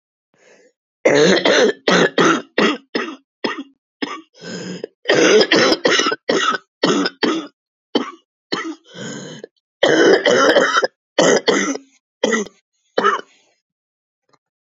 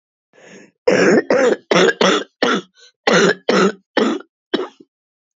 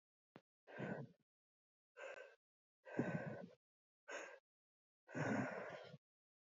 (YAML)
three_cough_length: 14.7 s
three_cough_amplitude: 32767
three_cough_signal_mean_std_ratio: 0.53
cough_length: 5.4 s
cough_amplitude: 30404
cough_signal_mean_std_ratio: 0.54
exhalation_length: 6.6 s
exhalation_amplitude: 1555
exhalation_signal_mean_std_ratio: 0.43
survey_phase: beta (2021-08-13 to 2022-03-07)
age: 45-64
gender: Female
wearing_mask: 'No'
symptom_cough_any: true
symptom_runny_or_blocked_nose: true
symptom_fatigue: true
symptom_headache: true
symptom_onset: 4 days
smoker_status: Never smoked
respiratory_condition_asthma: false
respiratory_condition_other: false
recruitment_source: Test and Trace
submission_delay: 2 days
covid_test_result: Positive
covid_test_method: RT-qPCR
covid_ct_value: 13.9
covid_ct_gene: ORF1ab gene
covid_ct_mean: 14.1
covid_viral_load: 23000000 copies/ml
covid_viral_load_category: High viral load (>1M copies/ml)